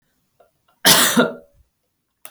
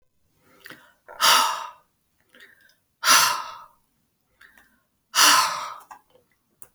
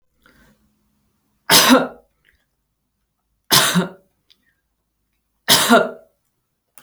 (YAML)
cough_length: 2.3 s
cough_amplitude: 32768
cough_signal_mean_std_ratio: 0.35
exhalation_length: 6.7 s
exhalation_amplitude: 24954
exhalation_signal_mean_std_ratio: 0.35
three_cough_length: 6.8 s
three_cough_amplitude: 32768
three_cough_signal_mean_std_ratio: 0.32
survey_phase: beta (2021-08-13 to 2022-03-07)
age: 45-64
gender: Female
wearing_mask: 'No'
symptom_none: true
smoker_status: Never smoked
respiratory_condition_asthma: false
respiratory_condition_other: false
recruitment_source: REACT
submission_delay: 1 day
covid_test_result: Negative
covid_test_method: RT-qPCR